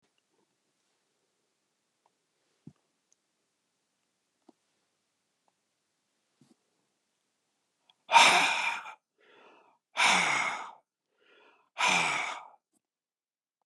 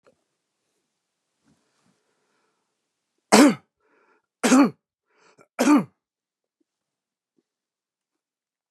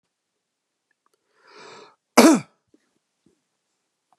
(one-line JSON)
{"exhalation_length": "13.7 s", "exhalation_amplitude": 16476, "exhalation_signal_mean_std_ratio": 0.27, "three_cough_length": "8.7 s", "three_cough_amplitude": 31397, "three_cough_signal_mean_std_ratio": 0.23, "cough_length": "4.2 s", "cough_amplitude": 32087, "cough_signal_mean_std_ratio": 0.19, "survey_phase": "beta (2021-08-13 to 2022-03-07)", "age": "65+", "gender": "Male", "wearing_mask": "No", "symptom_none": true, "smoker_status": "Ex-smoker", "respiratory_condition_asthma": true, "respiratory_condition_other": false, "recruitment_source": "REACT", "submission_delay": "2 days", "covid_test_result": "Negative", "covid_test_method": "RT-qPCR", "influenza_a_test_result": "Negative", "influenza_b_test_result": "Negative"}